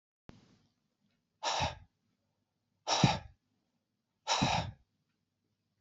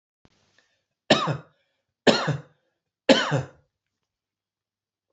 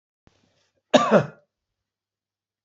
{"exhalation_length": "5.8 s", "exhalation_amplitude": 8530, "exhalation_signal_mean_std_ratio": 0.32, "three_cough_length": "5.1 s", "three_cough_amplitude": 25988, "three_cough_signal_mean_std_ratio": 0.28, "cough_length": "2.6 s", "cough_amplitude": 27750, "cough_signal_mean_std_ratio": 0.24, "survey_phase": "beta (2021-08-13 to 2022-03-07)", "age": "65+", "gender": "Male", "wearing_mask": "No", "symptom_fatigue": true, "smoker_status": "Ex-smoker", "respiratory_condition_asthma": false, "respiratory_condition_other": true, "recruitment_source": "REACT", "submission_delay": "2 days", "covid_test_result": "Negative", "covid_test_method": "RT-qPCR", "influenza_a_test_result": "Negative", "influenza_b_test_result": "Negative"}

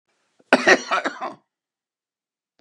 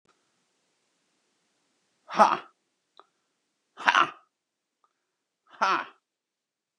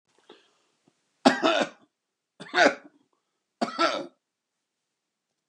{"cough_length": "2.6 s", "cough_amplitude": 32767, "cough_signal_mean_std_ratio": 0.3, "exhalation_length": "6.8 s", "exhalation_amplitude": 30969, "exhalation_signal_mean_std_ratio": 0.22, "three_cough_length": "5.5 s", "three_cough_amplitude": 20871, "three_cough_signal_mean_std_ratio": 0.29, "survey_phase": "beta (2021-08-13 to 2022-03-07)", "age": "45-64", "gender": "Male", "wearing_mask": "No", "symptom_none": true, "smoker_status": "Never smoked", "respiratory_condition_asthma": false, "respiratory_condition_other": false, "recruitment_source": "REACT", "submission_delay": "1 day", "covid_test_result": "Negative", "covid_test_method": "RT-qPCR", "influenza_a_test_result": "Negative", "influenza_b_test_result": "Negative"}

